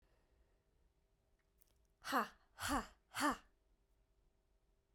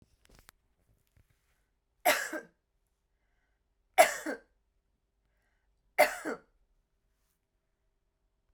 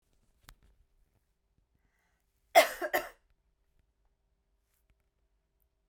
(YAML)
exhalation_length: 4.9 s
exhalation_amplitude: 2457
exhalation_signal_mean_std_ratio: 0.3
three_cough_length: 8.5 s
three_cough_amplitude: 14909
three_cough_signal_mean_std_ratio: 0.2
cough_length: 5.9 s
cough_amplitude: 13094
cough_signal_mean_std_ratio: 0.16
survey_phase: beta (2021-08-13 to 2022-03-07)
age: 18-44
gender: Female
wearing_mask: 'No'
symptom_none: true
smoker_status: Never smoked
respiratory_condition_asthma: false
respiratory_condition_other: false
recruitment_source: REACT
submission_delay: 1 day
covid_test_result: Negative
covid_test_method: RT-qPCR